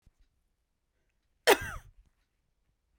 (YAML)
cough_length: 3.0 s
cough_amplitude: 13125
cough_signal_mean_std_ratio: 0.17
survey_phase: beta (2021-08-13 to 2022-03-07)
age: 45-64
gender: Female
wearing_mask: 'No'
symptom_new_continuous_cough: true
symptom_runny_or_blocked_nose: true
symptom_fatigue: true
symptom_headache: true
smoker_status: Never smoked
respiratory_condition_asthma: true
respiratory_condition_other: false
recruitment_source: Test and Trace
submission_delay: 2 days
covid_test_result: Positive
covid_test_method: RT-qPCR
covid_ct_value: 16.2
covid_ct_gene: ORF1ab gene
covid_ct_mean: 16.4
covid_viral_load: 4100000 copies/ml
covid_viral_load_category: High viral load (>1M copies/ml)